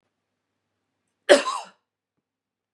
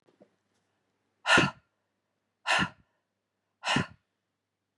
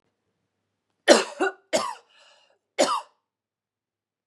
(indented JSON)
{
  "cough_length": "2.7 s",
  "cough_amplitude": 32694,
  "cough_signal_mean_std_ratio": 0.2,
  "exhalation_length": "4.8 s",
  "exhalation_amplitude": 11399,
  "exhalation_signal_mean_std_ratio": 0.28,
  "three_cough_length": "4.3 s",
  "three_cough_amplitude": 32355,
  "three_cough_signal_mean_std_ratio": 0.27,
  "survey_phase": "beta (2021-08-13 to 2022-03-07)",
  "age": "18-44",
  "gender": "Female",
  "wearing_mask": "No",
  "symptom_none": true,
  "smoker_status": "Never smoked",
  "respiratory_condition_asthma": false,
  "respiratory_condition_other": false,
  "recruitment_source": "REACT",
  "submission_delay": "2 days",
  "covid_test_result": "Negative",
  "covid_test_method": "RT-qPCR",
  "influenza_a_test_result": "Unknown/Void",
  "influenza_b_test_result": "Unknown/Void"
}